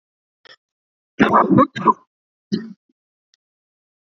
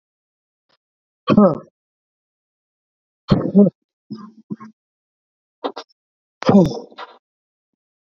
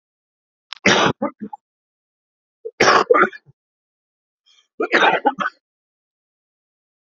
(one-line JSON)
{"cough_length": "4.0 s", "cough_amplitude": 27560, "cough_signal_mean_std_ratio": 0.31, "exhalation_length": "8.1 s", "exhalation_amplitude": 27648, "exhalation_signal_mean_std_ratio": 0.27, "three_cough_length": "7.2 s", "three_cough_amplitude": 28252, "three_cough_signal_mean_std_ratio": 0.33, "survey_phase": "beta (2021-08-13 to 2022-03-07)", "age": "45-64", "gender": "Male", "wearing_mask": "No", "symptom_cough_any": true, "symptom_runny_or_blocked_nose": true, "symptom_shortness_of_breath": true, "symptom_sore_throat": true, "symptom_fatigue": true, "symptom_fever_high_temperature": true, "symptom_headache": true, "symptom_onset": "4 days", "smoker_status": "Never smoked", "respiratory_condition_asthma": true, "respiratory_condition_other": false, "recruitment_source": "Test and Trace", "submission_delay": "2 days", "covid_test_result": "Positive", "covid_test_method": "RT-qPCR", "covid_ct_value": 28.2, "covid_ct_gene": "N gene", "covid_ct_mean": 28.8, "covid_viral_load": "350 copies/ml", "covid_viral_load_category": "Minimal viral load (< 10K copies/ml)"}